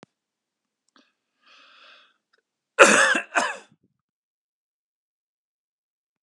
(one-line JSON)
{"cough_length": "6.2 s", "cough_amplitude": 32768, "cough_signal_mean_std_ratio": 0.22, "survey_phase": "beta (2021-08-13 to 2022-03-07)", "age": "45-64", "gender": "Male", "wearing_mask": "No", "symptom_cough_any": true, "smoker_status": "Never smoked", "respiratory_condition_asthma": false, "respiratory_condition_other": false, "recruitment_source": "Test and Trace", "submission_delay": "2 days", "covid_test_result": "Positive", "covid_test_method": "RT-qPCR"}